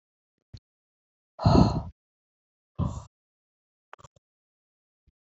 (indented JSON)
{
  "exhalation_length": "5.3 s",
  "exhalation_amplitude": 16669,
  "exhalation_signal_mean_std_ratio": 0.23,
  "survey_phase": "alpha (2021-03-01 to 2021-08-12)",
  "age": "18-44",
  "gender": "Female",
  "wearing_mask": "No",
  "symptom_none": true,
  "smoker_status": "Current smoker (e-cigarettes or vapes only)",
  "respiratory_condition_asthma": false,
  "respiratory_condition_other": false,
  "recruitment_source": "REACT",
  "submission_delay": "1 day",
  "covid_test_result": "Negative",
  "covid_test_method": "RT-qPCR"
}